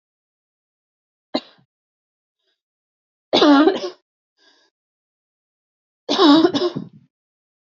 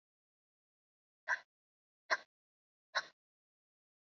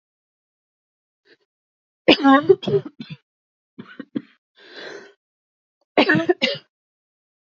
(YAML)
three_cough_length: 7.7 s
three_cough_amplitude: 31207
three_cough_signal_mean_std_ratio: 0.3
exhalation_length: 4.1 s
exhalation_amplitude: 3913
exhalation_signal_mean_std_ratio: 0.17
cough_length: 7.4 s
cough_amplitude: 32768
cough_signal_mean_std_ratio: 0.29
survey_phase: alpha (2021-03-01 to 2021-08-12)
age: 18-44
gender: Female
wearing_mask: 'No'
symptom_cough_any: true
symptom_fatigue: true
symptom_headache: true
smoker_status: Prefer not to say
respiratory_condition_asthma: false
respiratory_condition_other: false
recruitment_source: Test and Trace
submission_delay: 1 day
covid_test_result: Positive
covid_test_method: RT-qPCR
covid_ct_value: 37.2
covid_ct_gene: ORF1ab gene